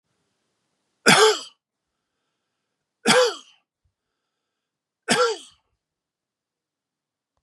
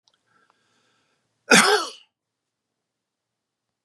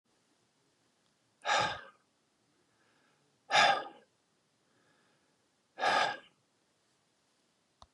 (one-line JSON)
{"three_cough_length": "7.4 s", "three_cough_amplitude": 32426, "three_cough_signal_mean_std_ratio": 0.26, "cough_length": "3.8 s", "cough_amplitude": 29510, "cough_signal_mean_std_ratio": 0.23, "exhalation_length": "7.9 s", "exhalation_amplitude": 7262, "exhalation_signal_mean_std_ratio": 0.28, "survey_phase": "beta (2021-08-13 to 2022-03-07)", "age": "45-64", "gender": "Male", "wearing_mask": "No", "symptom_none": true, "smoker_status": "Never smoked", "respiratory_condition_asthma": false, "respiratory_condition_other": false, "recruitment_source": "REACT", "submission_delay": "2 days", "covid_test_result": "Negative", "covid_test_method": "RT-qPCR", "influenza_a_test_result": "Negative", "influenza_b_test_result": "Negative"}